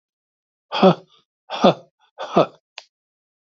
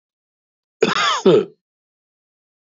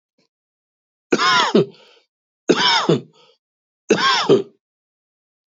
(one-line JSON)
{"exhalation_length": "3.5 s", "exhalation_amplitude": 28994, "exhalation_signal_mean_std_ratio": 0.28, "cough_length": "2.7 s", "cough_amplitude": 26670, "cough_signal_mean_std_ratio": 0.35, "three_cough_length": "5.5 s", "three_cough_amplitude": 26754, "three_cough_signal_mean_std_ratio": 0.42, "survey_phase": "beta (2021-08-13 to 2022-03-07)", "age": "65+", "gender": "Male", "wearing_mask": "No", "symptom_runny_or_blocked_nose": true, "smoker_status": "Ex-smoker", "respiratory_condition_asthma": false, "respiratory_condition_other": true, "recruitment_source": "REACT", "submission_delay": "1 day", "covid_test_result": "Negative", "covid_test_method": "RT-qPCR", "influenza_a_test_result": "Negative", "influenza_b_test_result": "Negative"}